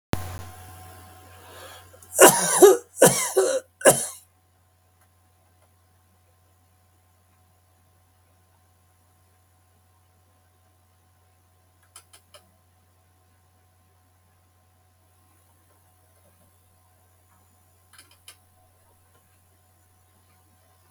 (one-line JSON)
{"three_cough_length": "20.9 s", "three_cough_amplitude": 32768, "three_cough_signal_mean_std_ratio": 0.2, "survey_phase": "beta (2021-08-13 to 2022-03-07)", "age": "65+", "gender": "Male", "wearing_mask": "No", "symptom_diarrhoea": true, "smoker_status": "Never smoked", "respiratory_condition_asthma": false, "respiratory_condition_other": false, "recruitment_source": "REACT", "submission_delay": "2 days", "covid_test_result": "Negative", "covid_test_method": "RT-qPCR", "influenza_a_test_result": "Negative", "influenza_b_test_result": "Negative"}